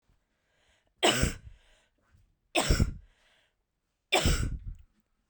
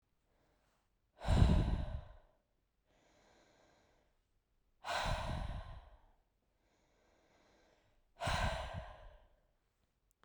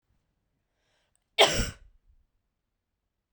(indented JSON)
{
  "three_cough_length": "5.3 s",
  "three_cough_amplitude": 9854,
  "three_cough_signal_mean_std_ratio": 0.37,
  "exhalation_length": "10.2 s",
  "exhalation_amplitude": 6021,
  "exhalation_signal_mean_std_ratio": 0.35,
  "cough_length": "3.3 s",
  "cough_amplitude": 21073,
  "cough_signal_mean_std_ratio": 0.21,
  "survey_phase": "beta (2021-08-13 to 2022-03-07)",
  "age": "18-44",
  "gender": "Female",
  "wearing_mask": "No",
  "symptom_cough_any": true,
  "symptom_runny_or_blocked_nose": true,
  "symptom_shortness_of_breath": true,
  "symptom_sore_throat": true,
  "symptom_fatigue": true,
  "symptom_headache": true,
  "symptom_other": true,
  "smoker_status": "Never smoked",
  "respiratory_condition_asthma": false,
  "respiratory_condition_other": false,
  "recruitment_source": "Test and Trace",
  "submission_delay": "2 days",
  "covid_test_result": "Positive",
  "covid_test_method": "LAMP"
}